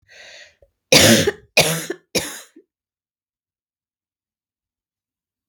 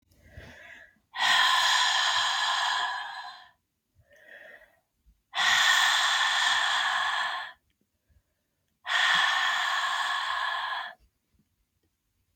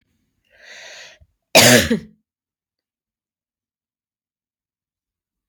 {"three_cough_length": "5.5 s", "three_cough_amplitude": 32768, "three_cough_signal_mean_std_ratio": 0.28, "exhalation_length": "12.4 s", "exhalation_amplitude": 9655, "exhalation_signal_mean_std_ratio": 0.64, "cough_length": "5.5 s", "cough_amplitude": 32768, "cough_signal_mean_std_ratio": 0.22, "survey_phase": "beta (2021-08-13 to 2022-03-07)", "age": "45-64", "gender": "Female", "wearing_mask": "No", "symptom_cough_any": true, "symptom_runny_or_blocked_nose": true, "symptom_sore_throat": true, "symptom_abdominal_pain": true, "symptom_diarrhoea": true, "symptom_fatigue": true, "symptom_headache": true, "symptom_other": true, "symptom_onset": "4 days", "smoker_status": "Ex-smoker", "respiratory_condition_asthma": false, "respiratory_condition_other": false, "recruitment_source": "Test and Trace", "submission_delay": "1 day", "covid_test_result": "Positive", "covid_test_method": "RT-qPCR", "covid_ct_value": 30.6, "covid_ct_gene": "N gene"}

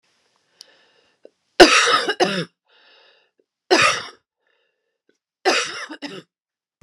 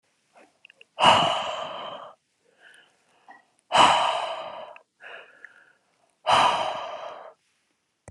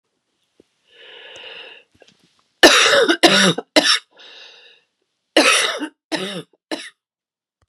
{"three_cough_length": "6.8 s", "three_cough_amplitude": 32768, "three_cough_signal_mean_std_ratio": 0.32, "exhalation_length": "8.1 s", "exhalation_amplitude": 24653, "exhalation_signal_mean_std_ratio": 0.39, "cough_length": "7.7 s", "cough_amplitude": 32768, "cough_signal_mean_std_ratio": 0.38, "survey_phase": "beta (2021-08-13 to 2022-03-07)", "age": "45-64", "gender": "Female", "wearing_mask": "No", "symptom_cough_any": true, "symptom_runny_or_blocked_nose": true, "symptom_sore_throat": true, "symptom_fatigue": true, "symptom_headache": true, "symptom_loss_of_taste": true, "symptom_onset": "5 days", "smoker_status": "Never smoked", "respiratory_condition_asthma": false, "respiratory_condition_other": false, "recruitment_source": "REACT", "submission_delay": "1 day", "covid_test_result": "Negative", "covid_test_method": "RT-qPCR"}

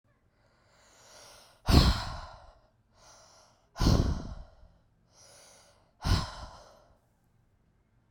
{"exhalation_length": "8.1 s", "exhalation_amplitude": 16198, "exhalation_signal_mean_std_ratio": 0.3, "survey_phase": "beta (2021-08-13 to 2022-03-07)", "age": "18-44", "gender": "Female", "wearing_mask": "No", "symptom_cough_any": true, "symptom_runny_or_blocked_nose": true, "symptom_sore_throat": true, "symptom_fatigue": true, "symptom_fever_high_temperature": true, "symptom_change_to_sense_of_smell_or_taste": true, "symptom_loss_of_taste": true, "symptom_onset": "2 days", "smoker_status": "Never smoked", "respiratory_condition_asthma": true, "respiratory_condition_other": false, "recruitment_source": "Test and Trace", "submission_delay": "1 day", "covid_test_result": "Positive", "covid_test_method": "RT-qPCR", "covid_ct_value": 14.7, "covid_ct_gene": "ORF1ab gene", "covid_ct_mean": 15.0, "covid_viral_load": "12000000 copies/ml", "covid_viral_load_category": "High viral load (>1M copies/ml)"}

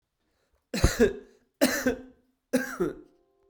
{"three_cough_length": "3.5 s", "three_cough_amplitude": 16327, "three_cough_signal_mean_std_ratio": 0.4, "survey_phase": "beta (2021-08-13 to 2022-03-07)", "age": "45-64", "gender": "Male", "wearing_mask": "No", "symptom_cough_any": true, "symptom_runny_or_blocked_nose": true, "symptom_fatigue": true, "symptom_change_to_sense_of_smell_or_taste": true, "symptom_onset": "7 days", "smoker_status": "Ex-smoker", "respiratory_condition_asthma": false, "respiratory_condition_other": false, "recruitment_source": "Test and Trace", "submission_delay": "1 day", "covid_test_result": "Positive", "covid_test_method": "RT-qPCR", "covid_ct_value": 23.6, "covid_ct_gene": "N gene", "covid_ct_mean": 24.3, "covid_viral_load": "11000 copies/ml", "covid_viral_load_category": "Low viral load (10K-1M copies/ml)"}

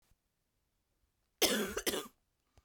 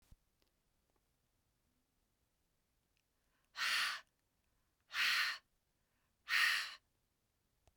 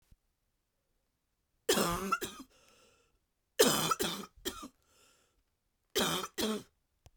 {"cough_length": "2.6 s", "cough_amplitude": 6864, "cough_signal_mean_std_ratio": 0.34, "exhalation_length": "7.8 s", "exhalation_amplitude": 2730, "exhalation_signal_mean_std_ratio": 0.33, "three_cough_length": "7.2 s", "three_cough_amplitude": 8654, "three_cough_signal_mean_std_ratio": 0.38, "survey_phase": "beta (2021-08-13 to 2022-03-07)", "age": "18-44", "gender": "Female", "wearing_mask": "No", "symptom_cough_any": true, "symptom_runny_or_blocked_nose": true, "symptom_shortness_of_breath": true, "symptom_fatigue": true, "symptom_change_to_sense_of_smell_or_taste": true, "symptom_loss_of_taste": true, "symptom_other": true, "smoker_status": "Prefer not to say", "respiratory_condition_asthma": false, "respiratory_condition_other": false, "recruitment_source": "Test and Trace", "submission_delay": "2 days", "covid_test_result": "Positive", "covid_test_method": "ePCR"}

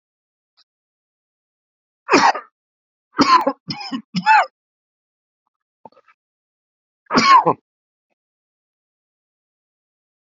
{"three_cough_length": "10.2 s", "three_cough_amplitude": 28848, "three_cough_signal_mean_std_ratio": 0.28, "survey_phase": "beta (2021-08-13 to 2022-03-07)", "age": "45-64", "gender": "Male", "wearing_mask": "No", "symptom_cough_any": true, "symptom_runny_or_blocked_nose": true, "symptom_sore_throat": true, "symptom_abdominal_pain": true, "symptom_diarrhoea": true, "symptom_fatigue": true, "symptom_headache": true, "smoker_status": "Never smoked", "respiratory_condition_asthma": false, "respiratory_condition_other": false, "recruitment_source": "Test and Trace", "submission_delay": "2 days", "covid_test_result": "Positive", "covid_test_method": "RT-qPCR"}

